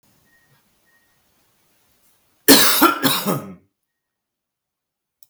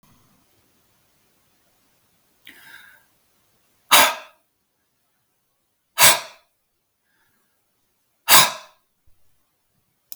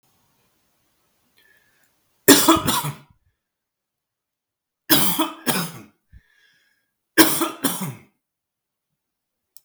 {
  "cough_length": "5.3 s",
  "cough_amplitude": 32768,
  "cough_signal_mean_std_ratio": 0.3,
  "exhalation_length": "10.2 s",
  "exhalation_amplitude": 32768,
  "exhalation_signal_mean_std_ratio": 0.2,
  "three_cough_length": "9.6 s",
  "three_cough_amplitude": 32768,
  "three_cough_signal_mean_std_ratio": 0.3,
  "survey_phase": "beta (2021-08-13 to 2022-03-07)",
  "age": "18-44",
  "gender": "Male",
  "wearing_mask": "No",
  "symptom_none": true,
  "smoker_status": "Never smoked",
  "respiratory_condition_asthma": false,
  "respiratory_condition_other": false,
  "recruitment_source": "REACT",
  "submission_delay": "1 day",
  "covid_test_result": "Negative",
  "covid_test_method": "RT-qPCR",
  "influenza_a_test_result": "Unknown/Void",
  "influenza_b_test_result": "Unknown/Void"
}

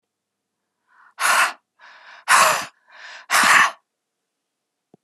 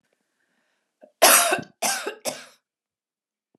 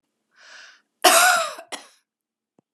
{
  "exhalation_length": "5.0 s",
  "exhalation_amplitude": 30268,
  "exhalation_signal_mean_std_ratio": 0.38,
  "three_cough_length": "3.6 s",
  "three_cough_amplitude": 32767,
  "three_cough_signal_mean_std_ratio": 0.31,
  "cough_length": "2.7 s",
  "cough_amplitude": 29203,
  "cough_signal_mean_std_ratio": 0.34,
  "survey_phase": "beta (2021-08-13 to 2022-03-07)",
  "age": "45-64",
  "gender": "Female",
  "wearing_mask": "No",
  "symptom_sore_throat": true,
  "symptom_headache": true,
  "symptom_onset": "2 days",
  "smoker_status": "Never smoked",
  "respiratory_condition_asthma": true,
  "respiratory_condition_other": false,
  "recruitment_source": "Test and Trace",
  "submission_delay": "2 days",
  "covid_test_result": "Positive",
  "covid_test_method": "RT-qPCR",
  "covid_ct_value": 28.7,
  "covid_ct_gene": "N gene"
}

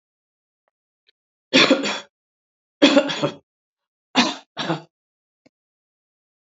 {
  "three_cough_length": "6.5 s",
  "three_cough_amplitude": 28934,
  "three_cough_signal_mean_std_ratio": 0.3,
  "survey_phase": "beta (2021-08-13 to 2022-03-07)",
  "age": "65+",
  "gender": "Female",
  "wearing_mask": "No",
  "symptom_cough_any": true,
  "symptom_runny_or_blocked_nose": true,
  "symptom_headache": true,
  "symptom_onset": "3 days",
  "smoker_status": "Ex-smoker",
  "respiratory_condition_asthma": false,
  "respiratory_condition_other": false,
  "recruitment_source": "Test and Trace",
  "submission_delay": "2 days",
  "covid_test_result": "Positive",
  "covid_test_method": "RT-qPCR",
  "covid_ct_value": 24.6,
  "covid_ct_gene": "N gene"
}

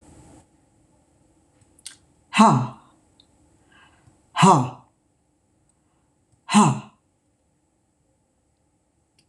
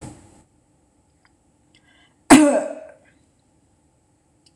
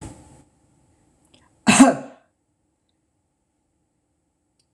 {
  "exhalation_length": "9.3 s",
  "exhalation_amplitude": 25801,
  "exhalation_signal_mean_std_ratio": 0.24,
  "three_cough_length": "4.6 s",
  "three_cough_amplitude": 26028,
  "three_cough_signal_mean_std_ratio": 0.23,
  "cough_length": "4.7 s",
  "cough_amplitude": 26028,
  "cough_signal_mean_std_ratio": 0.2,
  "survey_phase": "beta (2021-08-13 to 2022-03-07)",
  "age": "45-64",
  "gender": "Female",
  "wearing_mask": "No",
  "symptom_none": true,
  "smoker_status": "Never smoked",
  "respiratory_condition_asthma": false,
  "respiratory_condition_other": false,
  "recruitment_source": "REACT",
  "submission_delay": "1 day",
  "covid_test_result": "Negative",
  "covid_test_method": "RT-qPCR",
  "influenza_a_test_result": "Negative",
  "influenza_b_test_result": "Negative"
}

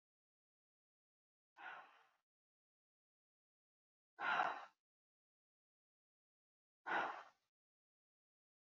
{
  "exhalation_length": "8.6 s",
  "exhalation_amplitude": 1764,
  "exhalation_signal_mean_std_ratio": 0.24,
  "survey_phase": "beta (2021-08-13 to 2022-03-07)",
  "age": "45-64",
  "gender": "Female",
  "wearing_mask": "No",
  "symptom_none": true,
  "smoker_status": "Ex-smoker",
  "respiratory_condition_asthma": false,
  "respiratory_condition_other": false,
  "recruitment_source": "REACT",
  "submission_delay": "2 days",
  "covid_test_result": "Negative",
  "covid_test_method": "RT-qPCR",
  "influenza_a_test_result": "Unknown/Void",
  "influenza_b_test_result": "Unknown/Void"
}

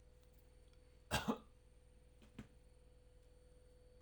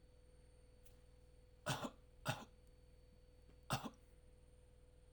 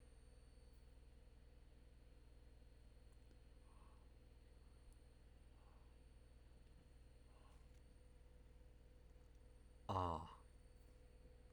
{
  "cough_length": "4.0 s",
  "cough_amplitude": 2087,
  "cough_signal_mean_std_ratio": 0.35,
  "three_cough_length": "5.1 s",
  "three_cough_amplitude": 1691,
  "three_cough_signal_mean_std_ratio": 0.42,
  "exhalation_length": "11.5 s",
  "exhalation_amplitude": 1015,
  "exhalation_signal_mean_std_ratio": 0.53,
  "survey_phase": "alpha (2021-03-01 to 2021-08-12)",
  "age": "45-64",
  "gender": "Male",
  "wearing_mask": "No",
  "symptom_none": true,
  "smoker_status": "Ex-smoker",
  "respiratory_condition_asthma": false,
  "respiratory_condition_other": false,
  "recruitment_source": "REACT",
  "submission_delay": "3 days",
  "covid_test_result": "Negative",
  "covid_test_method": "RT-qPCR"
}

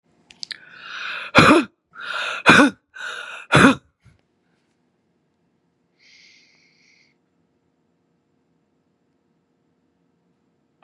{
  "exhalation_length": "10.8 s",
  "exhalation_amplitude": 32768,
  "exhalation_signal_mean_std_ratio": 0.25,
  "survey_phase": "beta (2021-08-13 to 2022-03-07)",
  "age": "45-64",
  "gender": "Female",
  "wearing_mask": "No",
  "symptom_cough_any": true,
  "symptom_runny_or_blocked_nose": true,
  "symptom_sore_throat": true,
  "symptom_headache": true,
  "symptom_onset": "7 days",
  "smoker_status": "Ex-smoker",
  "respiratory_condition_asthma": true,
  "respiratory_condition_other": false,
  "recruitment_source": "Test and Trace",
  "submission_delay": "2 days",
  "covid_test_result": "Positive",
  "covid_test_method": "RT-qPCR",
  "covid_ct_value": 30.5,
  "covid_ct_gene": "ORF1ab gene"
}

